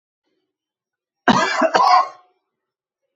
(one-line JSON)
{"cough_length": "3.2 s", "cough_amplitude": 32436, "cough_signal_mean_std_ratio": 0.39, "survey_phase": "alpha (2021-03-01 to 2021-08-12)", "age": "65+", "gender": "Male", "wearing_mask": "No", "symptom_none": true, "smoker_status": "Ex-smoker", "respiratory_condition_asthma": false, "respiratory_condition_other": false, "recruitment_source": "REACT", "submission_delay": "2 days", "covid_test_result": "Negative", "covid_test_method": "RT-qPCR"}